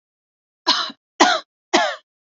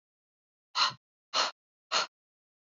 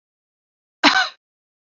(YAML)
three_cough_length: 2.4 s
three_cough_amplitude: 32768
three_cough_signal_mean_std_ratio: 0.38
exhalation_length: 2.7 s
exhalation_amplitude: 7845
exhalation_signal_mean_std_ratio: 0.32
cough_length: 1.7 s
cough_amplitude: 32768
cough_signal_mean_std_ratio: 0.28
survey_phase: beta (2021-08-13 to 2022-03-07)
age: 18-44
gender: Female
wearing_mask: 'No'
symptom_none: true
smoker_status: Never smoked
respiratory_condition_asthma: false
respiratory_condition_other: false
recruitment_source: REACT
submission_delay: 2 days
covid_test_result: Negative
covid_test_method: RT-qPCR